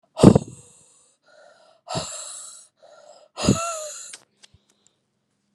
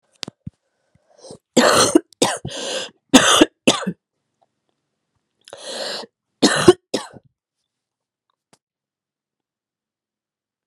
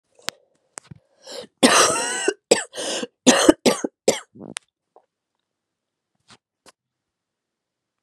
{"exhalation_length": "5.5 s", "exhalation_amplitude": 32768, "exhalation_signal_mean_std_ratio": 0.24, "three_cough_length": "10.7 s", "three_cough_amplitude": 32768, "three_cough_signal_mean_std_ratio": 0.29, "cough_length": "8.0 s", "cough_amplitude": 32767, "cough_signal_mean_std_ratio": 0.3, "survey_phase": "beta (2021-08-13 to 2022-03-07)", "age": "18-44", "gender": "Female", "wearing_mask": "No", "symptom_cough_any": true, "symptom_shortness_of_breath": true, "symptom_sore_throat": true, "symptom_diarrhoea": true, "symptom_fatigue": true, "symptom_fever_high_temperature": true, "symptom_headache": true, "symptom_change_to_sense_of_smell_or_taste": true, "symptom_other": true, "symptom_onset": "6 days", "smoker_status": "Ex-smoker", "respiratory_condition_asthma": false, "respiratory_condition_other": false, "recruitment_source": "Test and Trace", "submission_delay": "1 day", "covid_test_result": "Positive", "covid_test_method": "RT-qPCR", "covid_ct_value": 17.0, "covid_ct_gene": "ORF1ab gene", "covid_ct_mean": 17.6, "covid_viral_load": "1600000 copies/ml", "covid_viral_load_category": "High viral load (>1M copies/ml)"}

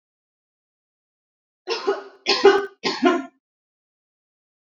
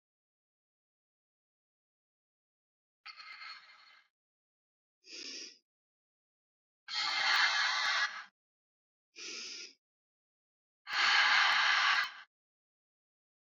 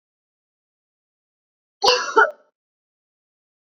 {"three_cough_length": "4.6 s", "three_cough_amplitude": 27224, "three_cough_signal_mean_std_ratio": 0.32, "exhalation_length": "13.5 s", "exhalation_amplitude": 5682, "exhalation_signal_mean_std_ratio": 0.38, "cough_length": "3.8 s", "cough_amplitude": 27319, "cough_signal_mean_std_ratio": 0.24, "survey_phase": "beta (2021-08-13 to 2022-03-07)", "age": "18-44", "gender": "Female", "wearing_mask": "No", "symptom_none": true, "symptom_onset": "10 days", "smoker_status": "Current smoker (e-cigarettes or vapes only)", "respiratory_condition_asthma": false, "respiratory_condition_other": false, "recruitment_source": "REACT", "submission_delay": "0 days", "covid_test_result": "Negative", "covid_test_method": "RT-qPCR"}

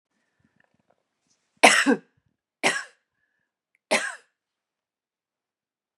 {"three_cough_length": "6.0 s", "three_cough_amplitude": 32760, "three_cough_signal_mean_std_ratio": 0.23, "survey_phase": "beta (2021-08-13 to 2022-03-07)", "age": "65+", "gender": "Female", "wearing_mask": "No", "symptom_none": true, "smoker_status": "Never smoked", "respiratory_condition_asthma": false, "respiratory_condition_other": false, "recruitment_source": "REACT", "submission_delay": "1 day", "covid_test_result": "Negative", "covid_test_method": "RT-qPCR", "influenza_a_test_result": "Negative", "influenza_b_test_result": "Negative"}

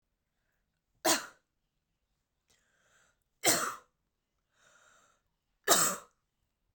{"three_cough_length": "6.7 s", "three_cough_amplitude": 10997, "three_cough_signal_mean_std_ratio": 0.25, "survey_phase": "beta (2021-08-13 to 2022-03-07)", "age": "18-44", "gender": "Female", "wearing_mask": "No", "symptom_runny_or_blocked_nose": true, "symptom_sore_throat": true, "symptom_headache": true, "smoker_status": "Never smoked", "respiratory_condition_asthma": false, "respiratory_condition_other": false, "recruitment_source": "Test and Trace", "submission_delay": "2 days", "covid_test_result": "Positive", "covid_test_method": "RT-qPCR", "covid_ct_value": 31.7, "covid_ct_gene": "ORF1ab gene"}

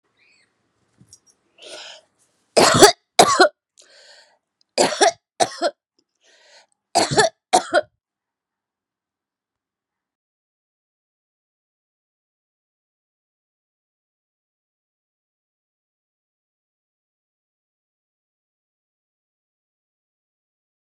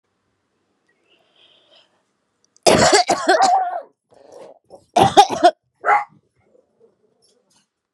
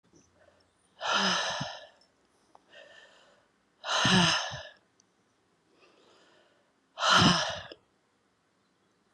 {"three_cough_length": "20.9 s", "three_cough_amplitude": 32768, "three_cough_signal_mean_std_ratio": 0.2, "cough_length": "7.9 s", "cough_amplitude": 32768, "cough_signal_mean_std_ratio": 0.35, "exhalation_length": "9.1 s", "exhalation_amplitude": 12553, "exhalation_signal_mean_std_ratio": 0.36, "survey_phase": "beta (2021-08-13 to 2022-03-07)", "age": "45-64", "gender": "Female", "wearing_mask": "Yes", "symptom_runny_or_blocked_nose": true, "symptom_fever_high_temperature": true, "symptom_change_to_sense_of_smell_or_taste": true, "symptom_loss_of_taste": true, "smoker_status": "Never smoked", "respiratory_condition_asthma": false, "respiratory_condition_other": false, "recruitment_source": "Test and Trace", "submission_delay": "1 day", "covid_test_result": "Positive", "covid_test_method": "RT-qPCR", "covid_ct_value": 24.0, "covid_ct_gene": "ORF1ab gene", "covid_ct_mean": 24.5, "covid_viral_load": "9500 copies/ml", "covid_viral_load_category": "Minimal viral load (< 10K copies/ml)"}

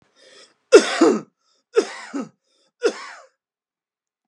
{"three_cough_length": "4.3 s", "three_cough_amplitude": 32768, "three_cough_signal_mean_std_ratio": 0.28, "survey_phase": "alpha (2021-03-01 to 2021-08-12)", "age": "18-44", "gender": "Male", "wearing_mask": "No", "symptom_none": true, "smoker_status": "Never smoked", "respiratory_condition_asthma": false, "respiratory_condition_other": false, "recruitment_source": "REACT", "submission_delay": "1 day", "covid_test_result": "Negative", "covid_test_method": "RT-qPCR"}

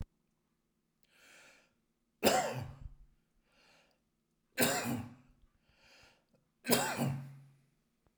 {"three_cough_length": "8.2 s", "three_cough_amplitude": 7228, "three_cough_signal_mean_std_ratio": 0.34, "survey_phase": "alpha (2021-03-01 to 2021-08-12)", "age": "65+", "gender": "Male", "wearing_mask": "No", "symptom_none": true, "smoker_status": "Never smoked", "respiratory_condition_asthma": false, "respiratory_condition_other": false, "recruitment_source": "REACT", "submission_delay": "2 days", "covid_test_result": "Negative", "covid_test_method": "RT-qPCR"}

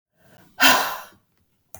{"exhalation_length": "1.8 s", "exhalation_amplitude": 32768, "exhalation_signal_mean_std_ratio": 0.34, "survey_phase": "beta (2021-08-13 to 2022-03-07)", "age": "45-64", "gender": "Female", "wearing_mask": "No", "symptom_cough_any": true, "symptom_runny_or_blocked_nose": true, "symptom_fatigue": true, "symptom_onset": "4 days", "smoker_status": "Never smoked", "respiratory_condition_asthma": true, "respiratory_condition_other": false, "recruitment_source": "Test and Trace", "submission_delay": "1 day", "covid_test_result": "Negative", "covid_test_method": "RT-qPCR"}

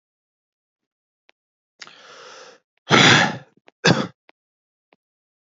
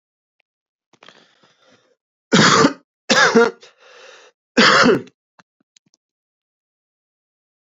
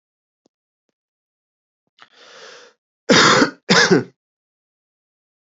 {"exhalation_length": "5.5 s", "exhalation_amplitude": 28972, "exhalation_signal_mean_std_ratio": 0.27, "three_cough_length": "7.8 s", "three_cough_amplitude": 32767, "three_cough_signal_mean_std_ratio": 0.33, "cough_length": "5.5 s", "cough_amplitude": 32768, "cough_signal_mean_std_ratio": 0.3, "survey_phase": "beta (2021-08-13 to 2022-03-07)", "age": "18-44", "gender": "Male", "wearing_mask": "No", "symptom_none": true, "smoker_status": "Current smoker (11 or more cigarettes per day)", "respiratory_condition_asthma": false, "respiratory_condition_other": false, "recruitment_source": "REACT", "submission_delay": "5 days", "covid_test_result": "Negative", "covid_test_method": "RT-qPCR", "influenza_a_test_result": "Negative", "influenza_b_test_result": "Negative"}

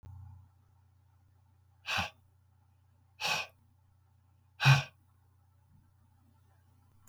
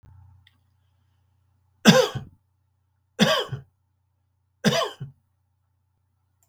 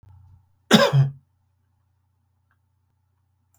{"exhalation_length": "7.1 s", "exhalation_amplitude": 9320, "exhalation_signal_mean_std_ratio": 0.24, "three_cough_length": "6.5 s", "three_cough_amplitude": 32766, "three_cough_signal_mean_std_ratio": 0.26, "cough_length": "3.6 s", "cough_amplitude": 31859, "cough_signal_mean_std_ratio": 0.26, "survey_phase": "beta (2021-08-13 to 2022-03-07)", "age": "65+", "gender": "Male", "wearing_mask": "No", "symptom_none": true, "smoker_status": "Never smoked", "respiratory_condition_asthma": false, "respiratory_condition_other": false, "recruitment_source": "REACT", "submission_delay": "1 day", "covid_test_result": "Negative", "covid_test_method": "RT-qPCR"}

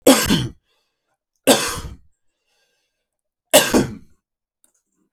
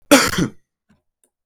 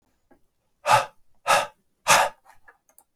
{"three_cough_length": "5.1 s", "three_cough_amplitude": 32768, "three_cough_signal_mean_std_ratio": 0.33, "cough_length": "1.5 s", "cough_amplitude": 32768, "cough_signal_mean_std_ratio": 0.35, "exhalation_length": "3.2 s", "exhalation_amplitude": 22305, "exhalation_signal_mean_std_ratio": 0.34, "survey_phase": "beta (2021-08-13 to 2022-03-07)", "age": "45-64", "gender": "Male", "wearing_mask": "No", "symptom_new_continuous_cough": true, "symptom_runny_or_blocked_nose": true, "symptom_fatigue": true, "symptom_headache": true, "symptom_change_to_sense_of_smell_or_taste": true, "smoker_status": "Current smoker (1 to 10 cigarettes per day)", "respiratory_condition_asthma": false, "respiratory_condition_other": false, "recruitment_source": "Test and Trace", "submission_delay": "1 day", "covid_test_result": "Positive", "covid_test_method": "LFT"}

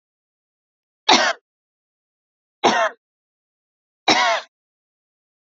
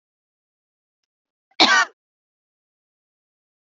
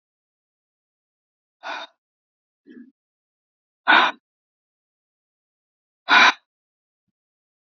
{"three_cough_length": "5.5 s", "three_cough_amplitude": 27510, "three_cough_signal_mean_std_ratio": 0.3, "cough_length": "3.7 s", "cough_amplitude": 31428, "cough_signal_mean_std_ratio": 0.2, "exhalation_length": "7.7 s", "exhalation_amplitude": 27346, "exhalation_signal_mean_std_ratio": 0.2, "survey_phase": "beta (2021-08-13 to 2022-03-07)", "age": "45-64", "gender": "Female", "wearing_mask": "No", "symptom_none": true, "smoker_status": "Never smoked", "respiratory_condition_asthma": false, "respiratory_condition_other": false, "recruitment_source": "REACT", "submission_delay": "2 days", "covid_test_result": "Negative", "covid_test_method": "RT-qPCR", "influenza_a_test_result": "Negative", "influenza_b_test_result": "Negative"}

